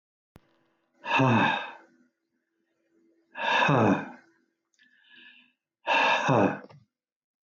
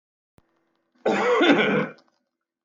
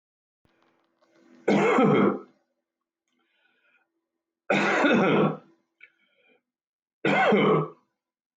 {
  "exhalation_length": "7.4 s",
  "exhalation_amplitude": 9730,
  "exhalation_signal_mean_std_ratio": 0.43,
  "cough_length": "2.6 s",
  "cough_amplitude": 19107,
  "cough_signal_mean_std_ratio": 0.48,
  "three_cough_length": "8.4 s",
  "three_cough_amplitude": 11815,
  "three_cough_signal_mean_std_ratio": 0.44,
  "survey_phase": "alpha (2021-03-01 to 2021-08-12)",
  "age": "45-64",
  "gender": "Male",
  "wearing_mask": "No",
  "symptom_cough_any": true,
  "symptom_onset": "12 days",
  "smoker_status": "Ex-smoker",
  "respiratory_condition_asthma": false,
  "respiratory_condition_other": false,
  "recruitment_source": "REACT",
  "submission_delay": "1 day",
  "covid_test_result": "Negative",
  "covid_test_method": "RT-qPCR"
}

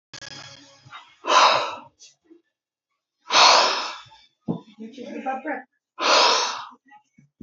{
  "exhalation_length": "7.4 s",
  "exhalation_amplitude": 26043,
  "exhalation_signal_mean_std_ratio": 0.42,
  "survey_phase": "alpha (2021-03-01 to 2021-08-12)",
  "age": "45-64",
  "gender": "Male",
  "wearing_mask": "No",
  "symptom_cough_any": true,
  "symptom_shortness_of_breath": true,
  "symptom_fatigue": true,
  "symptom_onset": "12 days",
  "smoker_status": "Never smoked",
  "respiratory_condition_asthma": false,
  "respiratory_condition_other": false,
  "recruitment_source": "REACT",
  "submission_delay": "1 day",
  "covid_test_result": "Negative",
  "covid_test_method": "RT-qPCR"
}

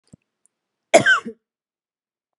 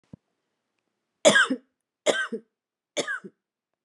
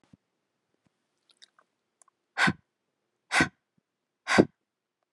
{
  "cough_length": "2.4 s",
  "cough_amplitude": 32157,
  "cough_signal_mean_std_ratio": 0.25,
  "three_cough_length": "3.8 s",
  "three_cough_amplitude": 25274,
  "three_cough_signal_mean_std_ratio": 0.3,
  "exhalation_length": "5.1 s",
  "exhalation_amplitude": 18059,
  "exhalation_signal_mean_std_ratio": 0.21,
  "survey_phase": "alpha (2021-03-01 to 2021-08-12)",
  "age": "45-64",
  "gender": "Female",
  "wearing_mask": "No",
  "symptom_none": true,
  "smoker_status": "Current smoker (11 or more cigarettes per day)",
  "respiratory_condition_asthma": false,
  "respiratory_condition_other": false,
  "recruitment_source": "REACT",
  "submission_delay": "2 days",
  "covid_test_result": "Negative",
  "covid_test_method": "RT-qPCR"
}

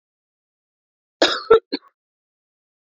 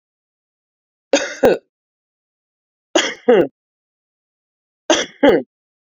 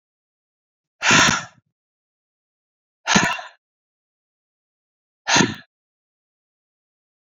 {
  "cough_length": "2.9 s",
  "cough_amplitude": 27289,
  "cough_signal_mean_std_ratio": 0.23,
  "three_cough_length": "5.9 s",
  "three_cough_amplitude": 32767,
  "three_cough_signal_mean_std_ratio": 0.32,
  "exhalation_length": "7.3 s",
  "exhalation_amplitude": 26119,
  "exhalation_signal_mean_std_ratio": 0.27,
  "survey_phase": "beta (2021-08-13 to 2022-03-07)",
  "age": "45-64",
  "gender": "Female",
  "wearing_mask": "No",
  "symptom_cough_any": true,
  "symptom_new_continuous_cough": true,
  "symptom_runny_or_blocked_nose": true,
  "symptom_sore_throat": true,
  "symptom_headache": true,
  "smoker_status": "Current smoker (e-cigarettes or vapes only)",
  "respiratory_condition_asthma": false,
  "respiratory_condition_other": false,
  "recruitment_source": "Test and Trace",
  "submission_delay": "1 day",
  "covid_test_result": "Positive",
  "covid_test_method": "LFT"
}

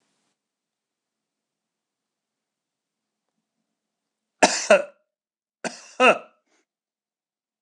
{
  "cough_length": "7.6 s",
  "cough_amplitude": 26028,
  "cough_signal_mean_std_ratio": 0.19,
  "survey_phase": "beta (2021-08-13 to 2022-03-07)",
  "age": "45-64",
  "gender": "Male",
  "wearing_mask": "No",
  "symptom_none": true,
  "smoker_status": "Never smoked",
  "respiratory_condition_asthma": false,
  "respiratory_condition_other": false,
  "recruitment_source": "REACT",
  "submission_delay": "1 day",
  "covid_test_result": "Negative",
  "covid_test_method": "RT-qPCR",
  "influenza_a_test_result": "Negative",
  "influenza_b_test_result": "Negative"
}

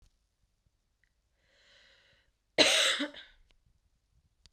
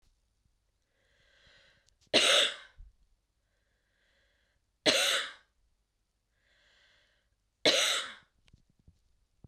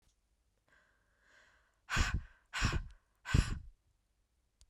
{
  "cough_length": "4.5 s",
  "cough_amplitude": 14311,
  "cough_signal_mean_std_ratio": 0.26,
  "three_cough_length": "9.5 s",
  "three_cough_amplitude": 10196,
  "three_cough_signal_mean_std_ratio": 0.29,
  "exhalation_length": "4.7 s",
  "exhalation_amplitude": 6141,
  "exhalation_signal_mean_std_ratio": 0.33,
  "survey_phase": "beta (2021-08-13 to 2022-03-07)",
  "age": "18-44",
  "gender": "Female",
  "wearing_mask": "No",
  "symptom_none": true,
  "symptom_onset": "12 days",
  "smoker_status": "Never smoked",
  "respiratory_condition_asthma": false,
  "respiratory_condition_other": false,
  "recruitment_source": "REACT",
  "submission_delay": "2 days",
  "covid_test_result": "Negative",
  "covid_test_method": "RT-qPCR",
  "influenza_a_test_result": "Negative",
  "influenza_b_test_result": "Negative"
}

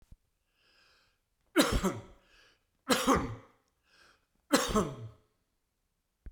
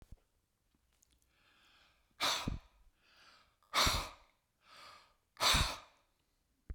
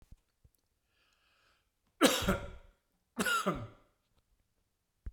{
  "three_cough_length": "6.3 s",
  "three_cough_amplitude": 11195,
  "three_cough_signal_mean_std_ratio": 0.34,
  "exhalation_length": "6.7 s",
  "exhalation_amplitude": 4506,
  "exhalation_signal_mean_std_ratio": 0.32,
  "cough_length": "5.1 s",
  "cough_amplitude": 10977,
  "cough_signal_mean_std_ratio": 0.31,
  "survey_phase": "beta (2021-08-13 to 2022-03-07)",
  "age": "65+",
  "gender": "Male",
  "wearing_mask": "No",
  "symptom_sore_throat": true,
  "symptom_headache": true,
  "symptom_onset": "4 days",
  "smoker_status": "Ex-smoker",
  "respiratory_condition_asthma": false,
  "respiratory_condition_other": false,
  "recruitment_source": "Test and Trace",
  "submission_delay": "2 days",
  "covid_test_result": "Positive",
  "covid_test_method": "RT-qPCR",
  "covid_ct_value": 38.0,
  "covid_ct_gene": "N gene"
}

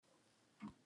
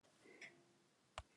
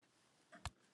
{
  "exhalation_length": "0.9 s",
  "exhalation_amplitude": 265,
  "exhalation_signal_mean_std_ratio": 0.43,
  "cough_length": "1.4 s",
  "cough_amplitude": 1126,
  "cough_signal_mean_std_ratio": 0.44,
  "three_cough_length": "0.9 s",
  "three_cough_amplitude": 1590,
  "three_cough_signal_mean_std_ratio": 0.29,
  "survey_phase": "alpha (2021-03-01 to 2021-08-12)",
  "age": "65+",
  "gender": "Male",
  "wearing_mask": "No",
  "symptom_none": true,
  "smoker_status": "Ex-smoker",
  "respiratory_condition_asthma": false,
  "respiratory_condition_other": false,
  "recruitment_source": "REACT",
  "submission_delay": "2 days",
  "covid_test_result": "Negative",
  "covid_test_method": "RT-qPCR"
}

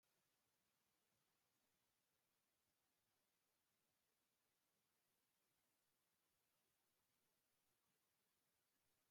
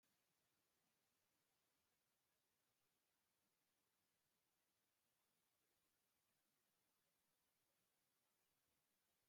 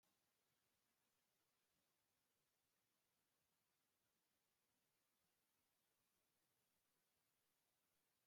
{
  "cough_length": "9.1 s",
  "cough_amplitude": 7,
  "cough_signal_mean_std_ratio": 0.81,
  "three_cough_length": "9.3 s",
  "three_cough_amplitude": 7,
  "three_cough_signal_mean_std_ratio": 0.81,
  "exhalation_length": "8.3 s",
  "exhalation_amplitude": 8,
  "exhalation_signal_mean_std_ratio": 0.81,
  "survey_phase": "beta (2021-08-13 to 2022-03-07)",
  "age": "65+",
  "gender": "Female",
  "wearing_mask": "No",
  "symptom_cough_any": true,
  "symptom_runny_or_blocked_nose": true,
  "symptom_onset": "12 days",
  "smoker_status": "Ex-smoker",
  "respiratory_condition_asthma": true,
  "respiratory_condition_other": false,
  "recruitment_source": "REACT",
  "submission_delay": "2 days",
  "covid_test_result": "Negative",
  "covid_test_method": "RT-qPCR"
}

